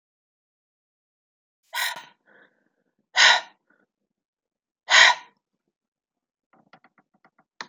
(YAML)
exhalation_length: 7.7 s
exhalation_amplitude: 28120
exhalation_signal_mean_std_ratio: 0.22
survey_phase: beta (2021-08-13 to 2022-03-07)
age: 45-64
gender: Female
wearing_mask: 'No'
symptom_cough_any: true
symptom_fatigue: true
symptom_change_to_sense_of_smell_or_taste: true
symptom_onset: 10 days
smoker_status: Ex-smoker
respiratory_condition_asthma: false
respiratory_condition_other: false
recruitment_source: Test and Trace
submission_delay: 2 days
covid_test_result: Positive
covid_test_method: RT-qPCR
covid_ct_value: 29.8
covid_ct_gene: ORF1ab gene